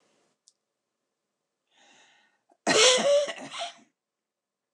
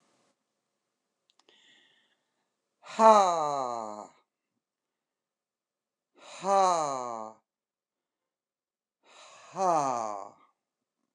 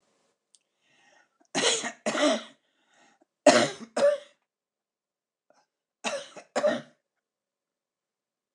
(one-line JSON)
{"cough_length": "4.7 s", "cough_amplitude": 16810, "cough_signal_mean_std_ratio": 0.33, "exhalation_length": "11.1 s", "exhalation_amplitude": 17215, "exhalation_signal_mean_std_ratio": 0.28, "three_cough_length": "8.5 s", "three_cough_amplitude": 20853, "three_cough_signal_mean_std_ratio": 0.31, "survey_phase": "beta (2021-08-13 to 2022-03-07)", "age": "65+", "gender": "Female", "wearing_mask": "No", "symptom_none": true, "smoker_status": "Current smoker (11 or more cigarettes per day)", "respiratory_condition_asthma": false, "respiratory_condition_other": false, "recruitment_source": "REACT", "submission_delay": "1 day", "covid_test_result": "Negative", "covid_test_method": "RT-qPCR", "influenza_a_test_result": "Negative", "influenza_b_test_result": "Negative"}